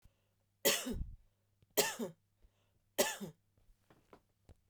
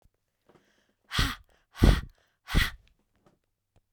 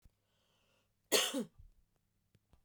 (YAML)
three_cough_length: 4.7 s
three_cough_amplitude: 6584
three_cough_signal_mean_std_ratio: 0.33
exhalation_length: 3.9 s
exhalation_amplitude: 21436
exhalation_signal_mean_std_ratio: 0.27
cough_length: 2.6 s
cough_amplitude: 5134
cough_signal_mean_std_ratio: 0.27
survey_phase: beta (2021-08-13 to 2022-03-07)
age: 45-64
gender: Female
wearing_mask: 'No'
symptom_none: true
smoker_status: Never smoked
respiratory_condition_asthma: false
respiratory_condition_other: false
recruitment_source: REACT
submission_delay: 2 days
covid_test_result: Negative
covid_test_method: RT-qPCR
influenza_a_test_result: Negative
influenza_b_test_result: Negative